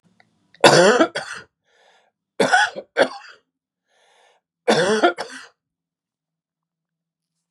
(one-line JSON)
{"three_cough_length": "7.5 s", "three_cough_amplitude": 32768, "three_cough_signal_mean_std_ratio": 0.33, "survey_phase": "beta (2021-08-13 to 2022-03-07)", "age": "45-64", "gender": "Male", "wearing_mask": "No", "symptom_cough_any": true, "smoker_status": "Never smoked", "respiratory_condition_asthma": false, "respiratory_condition_other": false, "recruitment_source": "Test and Trace", "submission_delay": "1 day", "covid_test_result": "Negative", "covid_test_method": "RT-qPCR"}